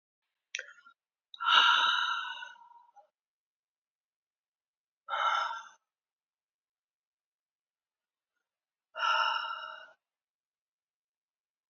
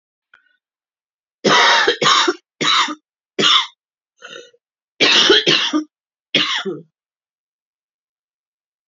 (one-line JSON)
{"exhalation_length": "11.7 s", "exhalation_amplitude": 12127, "exhalation_signal_mean_std_ratio": 0.33, "cough_length": "8.9 s", "cough_amplitude": 32768, "cough_signal_mean_std_ratio": 0.44, "survey_phase": "beta (2021-08-13 to 2022-03-07)", "age": "18-44", "gender": "Female", "wearing_mask": "No", "symptom_new_continuous_cough": true, "symptom_runny_or_blocked_nose": true, "symptom_sore_throat": true, "symptom_abdominal_pain": true, "symptom_fatigue": true, "symptom_fever_high_temperature": true, "symptom_headache": true, "symptom_onset": "3 days", "smoker_status": "Ex-smoker", "respiratory_condition_asthma": false, "respiratory_condition_other": false, "recruitment_source": "Test and Trace", "submission_delay": "2 days", "covid_test_result": "Positive", "covid_test_method": "ePCR"}